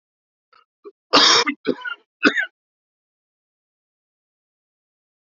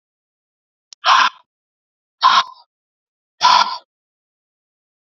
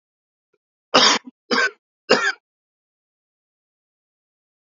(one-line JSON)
{"cough_length": "5.4 s", "cough_amplitude": 30159, "cough_signal_mean_std_ratio": 0.27, "exhalation_length": "5.0 s", "exhalation_amplitude": 31239, "exhalation_signal_mean_std_ratio": 0.31, "three_cough_length": "4.8 s", "three_cough_amplitude": 30331, "three_cough_signal_mean_std_ratio": 0.28, "survey_phase": "alpha (2021-03-01 to 2021-08-12)", "age": "18-44", "gender": "Male", "wearing_mask": "No", "symptom_cough_any": true, "symptom_fever_high_temperature": true, "symptom_onset": "3 days", "smoker_status": "Current smoker (1 to 10 cigarettes per day)", "respiratory_condition_asthma": false, "respiratory_condition_other": false, "recruitment_source": "Test and Trace", "submission_delay": "2 days", "covid_test_result": "Positive", "covid_test_method": "RT-qPCR", "covid_ct_value": 17.9, "covid_ct_gene": "N gene", "covid_ct_mean": 18.4, "covid_viral_load": "930000 copies/ml", "covid_viral_load_category": "Low viral load (10K-1M copies/ml)"}